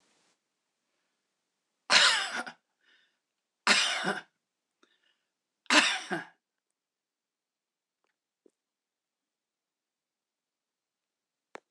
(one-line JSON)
{"three_cough_length": "11.7 s", "three_cough_amplitude": 14526, "three_cough_signal_mean_std_ratio": 0.25, "survey_phase": "beta (2021-08-13 to 2022-03-07)", "age": "65+", "gender": "Female", "wearing_mask": "No", "symptom_cough_any": true, "symptom_runny_or_blocked_nose": true, "smoker_status": "Never smoked", "respiratory_condition_asthma": false, "respiratory_condition_other": false, "recruitment_source": "REACT", "submission_delay": "0 days", "covid_test_result": "Negative", "covid_test_method": "RT-qPCR"}